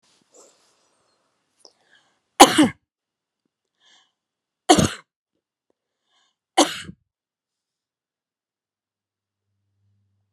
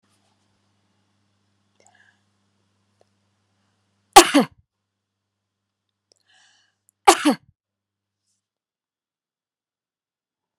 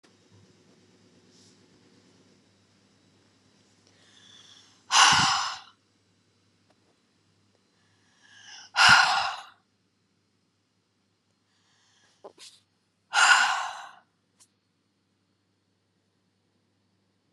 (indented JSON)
{
  "three_cough_length": "10.3 s",
  "three_cough_amplitude": 32768,
  "three_cough_signal_mean_std_ratio": 0.17,
  "cough_length": "10.6 s",
  "cough_amplitude": 32768,
  "cough_signal_mean_std_ratio": 0.14,
  "exhalation_length": "17.3 s",
  "exhalation_amplitude": 23434,
  "exhalation_signal_mean_std_ratio": 0.25,
  "survey_phase": "beta (2021-08-13 to 2022-03-07)",
  "age": "65+",
  "gender": "Female",
  "wearing_mask": "No",
  "symptom_none": true,
  "smoker_status": "Never smoked",
  "respiratory_condition_asthma": false,
  "respiratory_condition_other": false,
  "recruitment_source": "REACT",
  "submission_delay": "9 days",
  "covid_test_result": "Negative",
  "covid_test_method": "RT-qPCR"
}